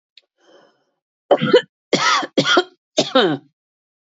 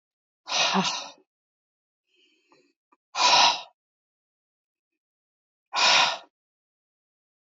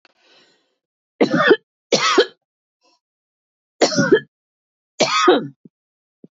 {"cough_length": "4.0 s", "cough_amplitude": 27423, "cough_signal_mean_std_ratio": 0.42, "exhalation_length": "7.5 s", "exhalation_amplitude": 17289, "exhalation_signal_mean_std_ratio": 0.33, "three_cough_length": "6.4 s", "three_cough_amplitude": 27542, "three_cough_signal_mean_std_ratio": 0.37, "survey_phase": "beta (2021-08-13 to 2022-03-07)", "age": "45-64", "gender": "Female", "wearing_mask": "No", "symptom_cough_any": true, "symptom_runny_or_blocked_nose": true, "symptom_onset": "12 days", "smoker_status": "Never smoked", "respiratory_condition_asthma": true, "respiratory_condition_other": false, "recruitment_source": "REACT", "submission_delay": "5 days", "covid_test_result": "Negative", "covid_test_method": "RT-qPCR", "influenza_a_test_result": "Negative", "influenza_b_test_result": "Negative"}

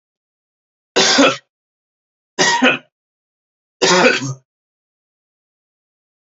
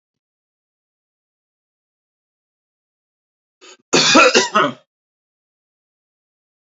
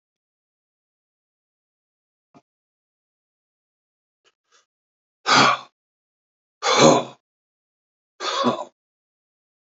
{"three_cough_length": "6.3 s", "three_cough_amplitude": 30511, "three_cough_signal_mean_std_ratio": 0.36, "cough_length": "6.7 s", "cough_amplitude": 32767, "cough_signal_mean_std_ratio": 0.25, "exhalation_length": "9.7 s", "exhalation_amplitude": 29973, "exhalation_signal_mean_std_ratio": 0.24, "survey_phase": "beta (2021-08-13 to 2022-03-07)", "age": "65+", "gender": "Male", "wearing_mask": "No", "symptom_none": true, "smoker_status": "Never smoked", "respiratory_condition_asthma": false, "respiratory_condition_other": false, "recruitment_source": "REACT", "submission_delay": "6 days", "covid_test_result": "Negative", "covid_test_method": "RT-qPCR", "influenza_a_test_result": "Negative", "influenza_b_test_result": "Negative"}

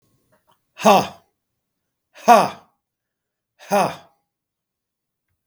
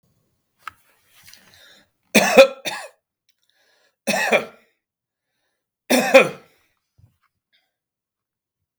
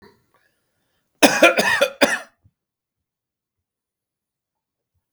{"exhalation_length": "5.5 s", "exhalation_amplitude": 32766, "exhalation_signal_mean_std_ratio": 0.26, "three_cough_length": "8.8 s", "three_cough_amplitude": 32766, "three_cough_signal_mean_std_ratio": 0.25, "cough_length": "5.1 s", "cough_amplitude": 32768, "cough_signal_mean_std_ratio": 0.27, "survey_phase": "beta (2021-08-13 to 2022-03-07)", "age": "65+", "gender": "Male", "wearing_mask": "No", "symptom_none": true, "smoker_status": "Never smoked", "respiratory_condition_asthma": true, "respiratory_condition_other": false, "recruitment_source": "REACT", "submission_delay": "5 days", "covid_test_result": "Negative", "covid_test_method": "RT-qPCR"}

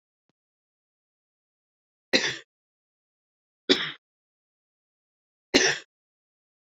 {"three_cough_length": "6.7 s", "three_cough_amplitude": 21225, "three_cough_signal_mean_std_ratio": 0.21, "survey_phase": "beta (2021-08-13 to 2022-03-07)", "age": "45-64", "gender": "Female", "wearing_mask": "No", "symptom_cough_any": true, "symptom_runny_or_blocked_nose": true, "symptom_fatigue": true, "symptom_headache": true, "symptom_onset": "3 days", "smoker_status": "Never smoked", "respiratory_condition_asthma": false, "respiratory_condition_other": false, "recruitment_source": "Test and Trace", "submission_delay": "1 day", "covid_test_result": "Positive", "covid_test_method": "RT-qPCR", "covid_ct_value": 35.9, "covid_ct_gene": "N gene"}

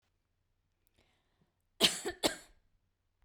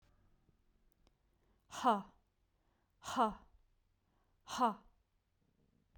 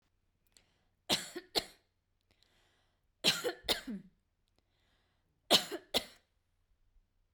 {"cough_length": "3.2 s", "cough_amplitude": 9189, "cough_signal_mean_std_ratio": 0.23, "exhalation_length": "6.0 s", "exhalation_amplitude": 3728, "exhalation_signal_mean_std_ratio": 0.26, "three_cough_length": "7.3 s", "three_cough_amplitude": 8478, "three_cough_signal_mean_std_ratio": 0.26, "survey_phase": "beta (2021-08-13 to 2022-03-07)", "age": "18-44", "gender": "Female", "wearing_mask": "No", "symptom_none": true, "smoker_status": "Never smoked", "respiratory_condition_asthma": false, "respiratory_condition_other": false, "recruitment_source": "REACT", "submission_delay": "3 days", "covid_test_result": "Negative", "covid_test_method": "RT-qPCR"}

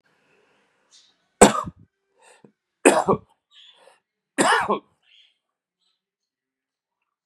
{"three_cough_length": "7.3 s", "three_cough_amplitude": 32768, "three_cough_signal_mean_std_ratio": 0.24, "survey_phase": "beta (2021-08-13 to 2022-03-07)", "age": "65+", "gender": "Male", "wearing_mask": "No", "symptom_none": true, "smoker_status": "Never smoked", "respiratory_condition_asthma": false, "respiratory_condition_other": false, "recruitment_source": "REACT", "submission_delay": "1 day", "covid_test_result": "Negative", "covid_test_method": "RT-qPCR"}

